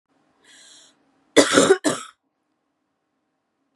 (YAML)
cough_length: 3.8 s
cough_amplitude: 32666
cough_signal_mean_std_ratio: 0.27
survey_phase: beta (2021-08-13 to 2022-03-07)
age: 18-44
gender: Female
wearing_mask: 'No'
symptom_cough_any: true
symptom_runny_or_blocked_nose: true
symptom_shortness_of_breath: true
symptom_sore_throat: true
symptom_fatigue: true
symptom_other: true
symptom_onset: 5 days
smoker_status: Never smoked
respiratory_condition_asthma: true
respiratory_condition_other: false
recruitment_source: Test and Trace
submission_delay: 1 day
covid_test_result: Positive
covid_test_method: RT-qPCR
covid_ct_value: 26.8
covid_ct_gene: N gene